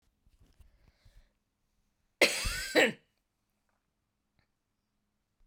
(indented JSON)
{
  "cough_length": "5.5 s",
  "cough_amplitude": 10837,
  "cough_signal_mean_std_ratio": 0.23,
  "survey_phase": "beta (2021-08-13 to 2022-03-07)",
  "age": "45-64",
  "gender": "Female",
  "wearing_mask": "No",
  "symptom_cough_any": true,
  "symptom_runny_or_blocked_nose": true,
  "symptom_headache": true,
  "symptom_other": true,
  "symptom_onset": "6 days",
  "smoker_status": "Never smoked",
  "respiratory_condition_asthma": false,
  "respiratory_condition_other": false,
  "recruitment_source": "Test and Trace",
  "submission_delay": "3 days",
  "covid_test_result": "Positive",
  "covid_test_method": "RT-qPCR"
}